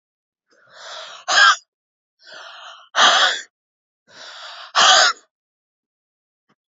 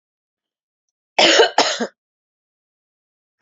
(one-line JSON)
{"exhalation_length": "6.7 s", "exhalation_amplitude": 32767, "exhalation_signal_mean_std_ratio": 0.35, "cough_length": "3.4 s", "cough_amplitude": 32768, "cough_signal_mean_std_ratio": 0.31, "survey_phase": "beta (2021-08-13 to 2022-03-07)", "age": "18-44", "gender": "Female", "wearing_mask": "No", "symptom_cough_any": true, "smoker_status": "Ex-smoker", "respiratory_condition_asthma": true, "respiratory_condition_other": false, "recruitment_source": "REACT", "submission_delay": "1 day", "covid_test_result": "Negative", "covid_test_method": "RT-qPCR"}